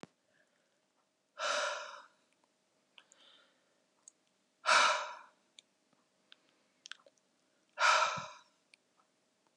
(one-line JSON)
{"exhalation_length": "9.6 s", "exhalation_amplitude": 6416, "exhalation_signal_mean_std_ratio": 0.29, "survey_phase": "beta (2021-08-13 to 2022-03-07)", "age": "45-64", "gender": "Female", "wearing_mask": "No", "symptom_cough_any": true, "symptom_new_continuous_cough": true, "symptom_runny_or_blocked_nose": true, "symptom_abdominal_pain": true, "symptom_fatigue": true, "symptom_fever_high_temperature": true, "symptom_headache": true, "symptom_change_to_sense_of_smell_or_taste": true, "symptom_loss_of_taste": true, "symptom_other": true, "symptom_onset": "6 days", "smoker_status": "Never smoked", "respiratory_condition_asthma": false, "respiratory_condition_other": false, "recruitment_source": "Test and Trace", "submission_delay": "4 days", "covid_test_result": "Positive", "covid_test_method": "RT-qPCR", "covid_ct_value": 20.0, "covid_ct_gene": "ORF1ab gene"}